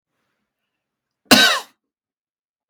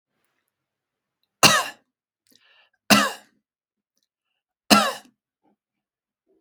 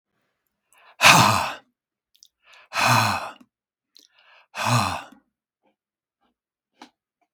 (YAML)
cough_length: 2.7 s
cough_amplitude: 32768
cough_signal_mean_std_ratio: 0.25
three_cough_length: 6.4 s
three_cough_amplitude: 32768
three_cough_signal_mean_std_ratio: 0.23
exhalation_length: 7.3 s
exhalation_amplitude: 32735
exhalation_signal_mean_std_ratio: 0.32
survey_phase: beta (2021-08-13 to 2022-03-07)
age: 65+
gender: Male
wearing_mask: 'No'
symptom_none: true
smoker_status: Never smoked
respiratory_condition_asthma: false
respiratory_condition_other: false
recruitment_source: REACT
submission_delay: 2 days
covid_test_result: Negative
covid_test_method: RT-qPCR
influenza_a_test_result: Negative
influenza_b_test_result: Negative